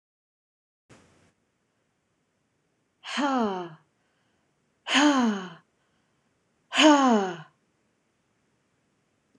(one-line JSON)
{"exhalation_length": "9.4 s", "exhalation_amplitude": 19595, "exhalation_signal_mean_std_ratio": 0.32, "survey_phase": "beta (2021-08-13 to 2022-03-07)", "age": "18-44", "gender": "Female", "wearing_mask": "No", "symptom_none": true, "smoker_status": "Prefer not to say", "respiratory_condition_asthma": false, "respiratory_condition_other": false, "recruitment_source": "REACT", "submission_delay": "9 days", "covid_test_result": "Negative", "covid_test_method": "RT-qPCR"}